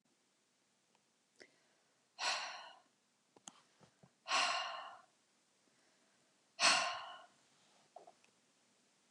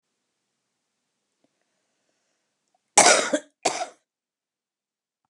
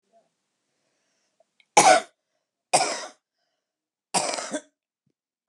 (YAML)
exhalation_length: 9.1 s
exhalation_amplitude: 4832
exhalation_signal_mean_std_ratio: 0.3
cough_length: 5.3 s
cough_amplitude: 31470
cough_signal_mean_std_ratio: 0.22
three_cough_length: 5.5 s
three_cough_amplitude: 26860
three_cough_signal_mean_std_ratio: 0.26
survey_phase: beta (2021-08-13 to 2022-03-07)
age: 45-64
gender: Female
wearing_mask: 'No'
symptom_diarrhoea: true
symptom_onset: 12 days
smoker_status: Current smoker (11 or more cigarettes per day)
respiratory_condition_asthma: false
respiratory_condition_other: false
recruitment_source: REACT
submission_delay: 3 days
covid_test_result: Negative
covid_test_method: RT-qPCR
influenza_a_test_result: Negative
influenza_b_test_result: Negative